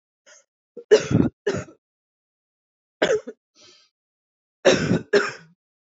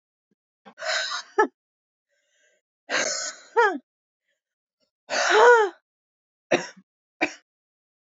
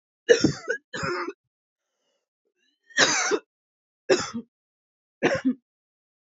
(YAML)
three_cough_length: 6.0 s
three_cough_amplitude: 25095
three_cough_signal_mean_std_ratio: 0.33
exhalation_length: 8.2 s
exhalation_amplitude: 19697
exhalation_signal_mean_std_ratio: 0.34
cough_length: 6.4 s
cough_amplitude: 21716
cough_signal_mean_std_ratio: 0.35
survey_phase: beta (2021-08-13 to 2022-03-07)
age: 18-44
gender: Female
wearing_mask: 'No'
symptom_runny_or_blocked_nose: true
symptom_shortness_of_breath: true
symptom_sore_throat: true
symptom_abdominal_pain: true
symptom_diarrhoea: true
symptom_fatigue: true
symptom_fever_high_temperature: true
symptom_headache: true
symptom_change_to_sense_of_smell_or_taste: true
smoker_status: Ex-smoker
respiratory_condition_asthma: false
respiratory_condition_other: false
recruitment_source: Test and Trace
submission_delay: 0 days
covid_test_result: Positive
covid_test_method: LFT